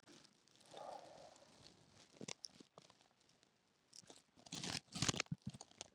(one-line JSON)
{"cough_length": "5.9 s", "cough_amplitude": 3453, "cough_signal_mean_std_ratio": 0.32, "survey_phase": "beta (2021-08-13 to 2022-03-07)", "age": "45-64", "gender": "Female", "wearing_mask": "No", "symptom_cough_any": true, "symptom_runny_or_blocked_nose": true, "symptom_shortness_of_breath": true, "symptom_sore_throat": true, "symptom_fatigue": true, "symptom_fever_high_temperature": true, "symptom_headache": true, "symptom_change_to_sense_of_smell_or_taste": true, "symptom_onset": "5 days", "smoker_status": "Ex-smoker", "respiratory_condition_asthma": false, "respiratory_condition_other": false, "recruitment_source": "Test and Trace", "submission_delay": "2 days", "covid_test_result": "Positive", "covid_test_method": "RT-qPCR", "covid_ct_value": 21.7, "covid_ct_gene": "N gene", "covid_ct_mean": 22.2, "covid_viral_load": "51000 copies/ml", "covid_viral_load_category": "Low viral load (10K-1M copies/ml)"}